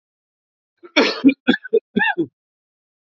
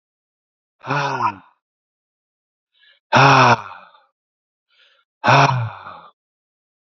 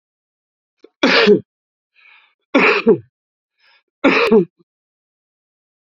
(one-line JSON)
{"cough_length": "3.1 s", "cough_amplitude": 29579, "cough_signal_mean_std_ratio": 0.36, "exhalation_length": "6.8 s", "exhalation_amplitude": 29137, "exhalation_signal_mean_std_ratio": 0.35, "three_cough_length": "5.8 s", "three_cough_amplitude": 29342, "three_cough_signal_mean_std_ratio": 0.37, "survey_phase": "beta (2021-08-13 to 2022-03-07)", "age": "45-64", "gender": "Male", "wearing_mask": "No", "symptom_none": true, "smoker_status": "Never smoked", "respiratory_condition_asthma": false, "respiratory_condition_other": false, "recruitment_source": "REACT", "submission_delay": "4 days", "covid_test_result": "Negative", "covid_test_method": "RT-qPCR", "influenza_a_test_result": "Negative", "influenza_b_test_result": "Negative"}